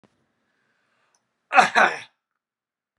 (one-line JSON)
{"cough_length": "3.0 s", "cough_amplitude": 31979, "cough_signal_mean_std_ratio": 0.25, "survey_phase": "alpha (2021-03-01 to 2021-08-12)", "age": "18-44", "gender": "Male", "wearing_mask": "No", "symptom_none": true, "symptom_onset": "12 days", "smoker_status": "Never smoked", "respiratory_condition_asthma": false, "respiratory_condition_other": false, "recruitment_source": "REACT", "submission_delay": "2 days", "covid_test_result": "Negative", "covid_test_method": "RT-qPCR"}